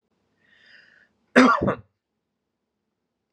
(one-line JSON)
{"cough_length": "3.3 s", "cough_amplitude": 27647, "cough_signal_mean_std_ratio": 0.25, "survey_phase": "beta (2021-08-13 to 2022-03-07)", "age": "18-44", "gender": "Male", "wearing_mask": "No", "symptom_none": true, "smoker_status": "Never smoked", "respiratory_condition_asthma": false, "respiratory_condition_other": false, "recruitment_source": "REACT", "submission_delay": "1 day", "covid_test_result": "Negative", "covid_test_method": "RT-qPCR"}